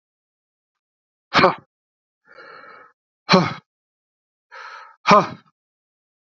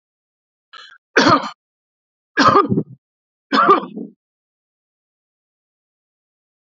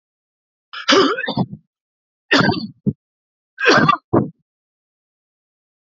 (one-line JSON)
{"exhalation_length": "6.2 s", "exhalation_amplitude": 32767, "exhalation_signal_mean_std_ratio": 0.24, "cough_length": "6.7 s", "cough_amplitude": 32767, "cough_signal_mean_std_ratio": 0.31, "three_cough_length": "5.8 s", "three_cough_amplitude": 29242, "three_cough_signal_mean_std_ratio": 0.39, "survey_phase": "alpha (2021-03-01 to 2021-08-12)", "age": "65+", "gender": "Male", "wearing_mask": "No", "symptom_none": true, "smoker_status": "Never smoked", "respiratory_condition_asthma": false, "respiratory_condition_other": false, "recruitment_source": "REACT", "submission_delay": "3 days", "covid_test_result": "Negative", "covid_test_method": "RT-qPCR"}